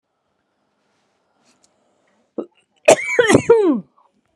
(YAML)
cough_length: 4.4 s
cough_amplitude: 32768
cough_signal_mean_std_ratio: 0.33
survey_phase: beta (2021-08-13 to 2022-03-07)
age: 18-44
gender: Female
wearing_mask: 'No'
symptom_cough_any: true
symptom_runny_or_blocked_nose: true
symptom_shortness_of_breath: true
symptom_sore_throat: true
symptom_diarrhoea: true
symptom_fatigue: true
symptom_fever_high_temperature: true
symptom_headache: true
symptom_onset: 2 days
smoker_status: Current smoker (e-cigarettes or vapes only)
respiratory_condition_asthma: true
respiratory_condition_other: true
recruitment_source: Test and Trace
submission_delay: 2 days
covid_test_result: Positive
covid_test_method: RT-qPCR
covid_ct_value: 20.1
covid_ct_gene: N gene